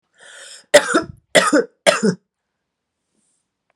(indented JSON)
{
  "three_cough_length": "3.8 s",
  "three_cough_amplitude": 32768,
  "three_cough_signal_mean_std_ratio": 0.34,
  "survey_phase": "beta (2021-08-13 to 2022-03-07)",
  "age": "45-64",
  "gender": "Female",
  "wearing_mask": "No",
  "symptom_runny_or_blocked_nose": true,
  "symptom_fatigue": true,
  "symptom_change_to_sense_of_smell_or_taste": true,
  "symptom_onset": "3 days",
  "smoker_status": "Current smoker (1 to 10 cigarettes per day)",
  "respiratory_condition_asthma": false,
  "respiratory_condition_other": false,
  "recruitment_source": "Test and Trace",
  "submission_delay": "2 days",
  "covid_test_result": "Positive",
  "covid_test_method": "RT-qPCR",
  "covid_ct_value": 18.4,
  "covid_ct_gene": "N gene"
}